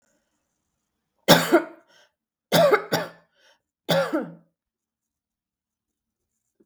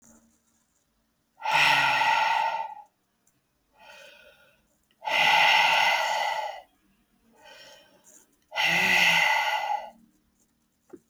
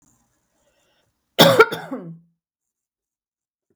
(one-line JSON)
{"three_cough_length": "6.7 s", "three_cough_amplitude": 32766, "three_cough_signal_mean_std_ratio": 0.3, "exhalation_length": "11.1 s", "exhalation_amplitude": 11968, "exhalation_signal_mean_std_ratio": 0.53, "cough_length": "3.8 s", "cough_amplitude": 32768, "cough_signal_mean_std_ratio": 0.24, "survey_phase": "beta (2021-08-13 to 2022-03-07)", "age": "45-64", "gender": "Female", "wearing_mask": "No", "symptom_cough_any": true, "symptom_onset": "13 days", "smoker_status": "Never smoked", "respiratory_condition_asthma": false, "respiratory_condition_other": false, "recruitment_source": "REACT", "submission_delay": "1 day", "covid_test_result": "Negative", "covid_test_method": "RT-qPCR"}